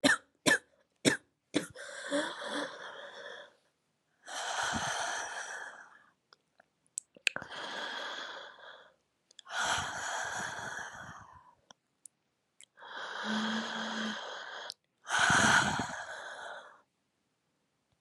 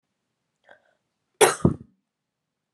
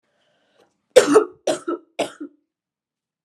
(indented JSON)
{
  "exhalation_length": "18.0 s",
  "exhalation_amplitude": 14525,
  "exhalation_signal_mean_std_ratio": 0.49,
  "cough_length": "2.7 s",
  "cough_amplitude": 28770,
  "cough_signal_mean_std_ratio": 0.2,
  "three_cough_length": "3.2 s",
  "three_cough_amplitude": 32768,
  "three_cough_signal_mean_std_ratio": 0.28,
  "survey_phase": "beta (2021-08-13 to 2022-03-07)",
  "age": "18-44",
  "gender": "Female",
  "wearing_mask": "No",
  "symptom_cough_any": true,
  "symptom_runny_or_blocked_nose": true,
  "symptom_sore_throat": true,
  "symptom_fatigue": true,
  "symptom_headache": true,
  "smoker_status": "Current smoker (1 to 10 cigarettes per day)",
  "respiratory_condition_asthma": false,
  "respiratory_condition_other": false,
  "recruitment_source": "Test and Trace",
  "submission_delay": "1 day",
  "covid_test_result": "Positive",
  "covid_test_method": "RT-qPCR",
  "covid_ct_value": 33.9,
  "covid_ct_gene": "ORF1ab gene",
  "covid_ct_mean": 33.9,
  "covid_viral_load": "7.6 copies/ml",
  "covid_viral_load_category": "Minimal viral load (< 10K copies/ml)"
}